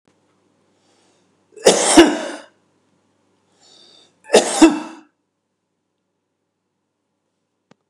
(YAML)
cough_length: 7.9 s
cough_amplitude: 32768
cough_signal_mean_std_ratio: 0.25
survey_phase: beta (2021-08-13 to 2022-03-07)
age: 65+
gender: Male
wearing_mask: 'No'
symptom_none: true
smoker_status: Never smoked
respiratory_condition_asthma: false
respiratory_condition_other: false
recruitment_source: REACT
submission_delay: 1 day
covid_test_result: Negative
covid_test_method: RT-qPCR
influenza_a_test_result: Negative
influenza_b_test_result: Negative